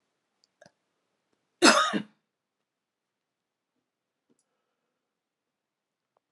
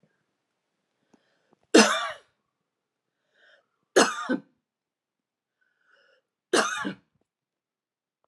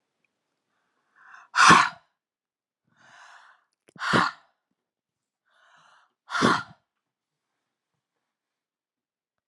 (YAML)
cough_length: 6.3 s
cough_amplitude: 25088
cough_signal_mean_std_ratio: 0.17
three_cough_length: 8.3 s
three_cough_amplitude: 26288
three_cough_signal_mean_std_ratio: 0.23
exhalation_length: 9.5 s
exhalation_amplitude: 28295
exhalation_signal_mean_std_ratio: 0.22
survey_phase: alpha (2021-03-01 to 2021-08-12)
age: 45-64
gender: Female
wearing_mask: 'No'
symptom_none: true
symptom_onset: 8 days
smoker_status: Never smoked
respiratory_condition_asthma: false
respiratory_condition_other: false
recruitment_source: REACT
submission_delay: 1 day
covid_test_result: Negative
covid_test_method: RT-qPCR